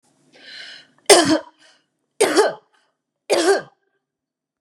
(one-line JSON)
{"three_cough_length": "4.6 s", "three_cough_amplitude": 32768, "three_cough_signal_mean_std_ratio": 0.35, "survey_phase": "beta (2021-08-13 to 2022-03-07)", "age": "65+", "gender": "Female", "wearing_mask": "No", "symptom_none": true, "smoker_status": "Ex-smoker", "respiratory_condition_asthma": false, "respiratory_condition_other": false, "recruitment_source": "REACT", "submission_delay": "2 days", "covid_test_result": "Negative", "covid_test_method": "RT-qPCR", "influenza_a_test_result": "Negative", "influenza_b_test_result": "Negative"}